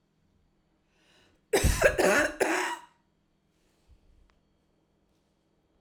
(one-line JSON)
{"three_cough_length": "5.8 s", "three_cough_amplitude": 14662, "three_cough_signal_mean_std_ratio": 0.34, "survey_phase": "alpha (2021-03-01 to 2021-08-12)", "age": "18-44", "gender": "Female", "wearing_mask": "No", "symptom_cough_any": true, "smoker_status": "Never smoked", "respiratory_condition_asthma": false, "respiratory_condition_other": false, "recruitment_source": "REACT", "submission_delay": "2 days", "covid_test_result": "Negative", "covid_test_method": "RT-qPCR"}